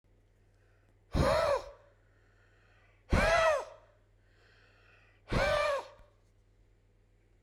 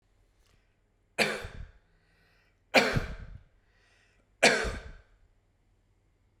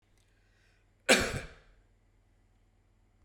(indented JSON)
{
  "exhalation_length": "7.4 s",
  "exhalation_amplitude": 5978,
  "exhalation_signal_mean_std_ratio": 0.4,
  "three_cough_length": "6.4 s",
  "three_cough_amplitude": 14462,
  "three_cough_signal_mean_std_ratio": 0.29,
  "cough_length": "3.2 s",
  "cough_amplitude": 12386,
  "cough_signal_mean_std_ratio": 0.23,
  "survey_phase": "beta (2021-08-13 to 2022-03-07)",
  "age": "45-64",
  "gender": "Male",
  "wearing_mask": "No",
  "symptom_sore_throat": true,
  "symptom_onset": "3 days",
  "smoker_status": "Never smoked",
  "respiratory_condition_asthma": false,
  "respiratory_condition_other": false,
  "recruitment_source": "Test and Trace",
  "submission_delay": "2 days",
  "covid_test_result": "Positive",
  "covid_test_method": "RT-qPCR",
  "covid_ct_value": 23.2,
  "covid_ct_gene": "ORF1ab gene"
}